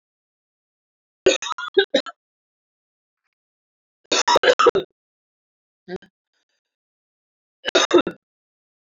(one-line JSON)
{"three_cough_length": "9.0 s", "three_cough_amplitude": 26791, "three_cough_signal_mean_std_ratio": 0.27, "survey_phase": "beta (2021-08-13 to 2022-03-07)", "age": "18-44", "gender": "Female", "wearing_mask": "No", "symptom_cough_any": true, "symptom_runny_or_blocked_nose": true, "symptom_shortness_of_breath": true, "symptom_sore_throat": true, "symptom_fatigue": true, "symptom_fever_high_temperature": true, "symptom_headache": true, "smoker_status": "Never smoked", "recruitment_source": "Test and Trace", "submission_delay": "2 days", "covid_test_result": "Positive", "covid_test_method": "RT-qPCR", "covid_ct_value": 14.5, "covid_ct_gene": "ORF1ab gene"}